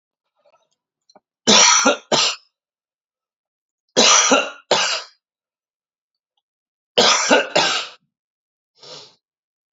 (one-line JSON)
{"three_cough_length": "9.7 s", "three_cough_amplitude": 32767, "three_cough_signal_mean_std_ratio": 0.39, "survey_phase": "alpha (2021-03-01 to 2021-08-12)", "age": "45-64", "gender": "Male", "wearing_mask": "No", "symptom_cough_any": true, "symptom_shortness_of_breath": true, "symptom_fatigue": true, "symptom_headache": true, "symptom_change_to_sense_of_smell_or_taste": true, "symptom_onset": "4 days", "smoker_status": "Never smoked", "respiratory_condition_asthma": false, "respiratory_condition_other": false, "recruitment_source": "Test and Trace", "submission_delay": "1 day", "covid_test_result": "Positive", "covid_test_method": "RT-qPCR", "covid_ct_value": 20.6, "covid_ct_gene": "ORF1ab gene", "covid_ct_mean": 21.1, "covid_viral_load": "120000 copies/ml", "covid_viral_load_category": "Low viral load (10K-1M copies/ml)"}